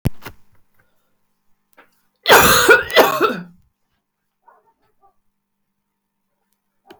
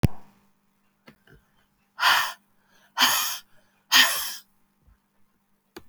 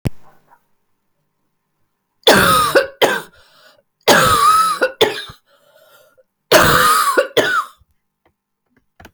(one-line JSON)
{"cough_length": "7.0 s", "cough_amplitude": 32768, "cough_signal_mean_std_ratio": 0.31, "exhalation_length": "5.9 s", "exhalation_amplitude": 22044, "exhalation_signal_mean_std_ratio": 0.35, "three_cough_length": "9.1 s", "three_cough_amplitude": 32767, "three_cough_signal_mean_std_ratio": 0.47, "survey_phase": "beta (2021-08-13 to 2022-03-07)", "age": "45-64", "gender": "Female", "wearing_mask": "No", "symptom_cough_any": true, "symptom_runny_or_blocked_nose": true, "symptom_headache": true, "symptom_change_to_sense_of_smell_or_taste": true, "symptom_onset": "4 days", "smoker_status": "Never smoked", "respiratory_condition_asthma": false, "respiratory_condition_other": false, "recruitment_source": "Test and Trace", "submission_delay": "1 day", "covid_test_result": "Positive", "covid_test_method": "RT-qPCR", "covid_ct_value": 17.0, "covid_ct_gene": "ORF1ab gene", "covid_ct_mean": 18.2, "covid_viral_load": "1100000 copies/ml", "covid_viral_load_category": "High viral load (>1M copies/ml)"}